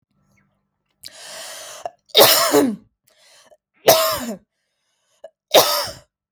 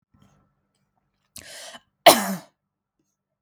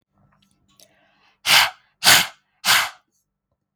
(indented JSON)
{
  "three_cough_length": "6.3 s",
  "three_cough_amplitude": 32768,
  "three_cough_signal_mean_std_ratio": 0.36,
  "cough_length": "3.4 s",
  "cough_amplitude": 32768,
  "cough_signal_mean_std_ratio": 0.19,
  "exhalation_length": "3.8 s",
  "exhalation_amplitude": 32768,
  "exhalation_signal_mean_std_ratio": 0.33,
  "survey_phase": "beta (2021-08-13 to 2022-03-07)",
  "age": "18-44",
  "gender": "Female",
  "wearing_mask": "No",
  "symptom_runny_or_blocked_nose": true,
  "smoker_status": "Never smoked",
  "respiratory_condition_asthma": false,
  "respiratory_condition_other": false,
  "recruitment_source": "REACT",
  "submission_delay": "1 day",
  "covid_test_result": "Negative",
  "covid_test_method": "RT-qPCR",
  "influenza_a_test_result": "Negative",
  "influenza_b_test_result": "Negative"
}